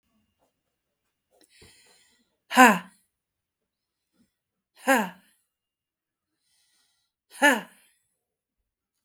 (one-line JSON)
{"exhalation_length": "9.0 s", "exhalation_amplitude": 24214, "exhalation_signal_mean_std_ratio": 0.2, "survey_phase": "beta (2021-08-13 to 2022-03-07)", "age": "45-64", "gender": "Female", "wearing_mask": "No", "symptom_cough_any": true, "symptom_runny_or_blocked_nose": true, "symptom_headache": true, "symptom_onset": "12 days", "smoker_status": "Never smoked", "respiratory_condition_asthma": true, "respiratory_condition_other": false, "recruitment_source": "REACT", "submission_delay": "0 days", "covid_test_result": "Negative", "covid_test_method": "RT-qPCR", "influenza_a_test_result": "Unknown/Void", "influenza_b_test_result": "Unknown/Void"}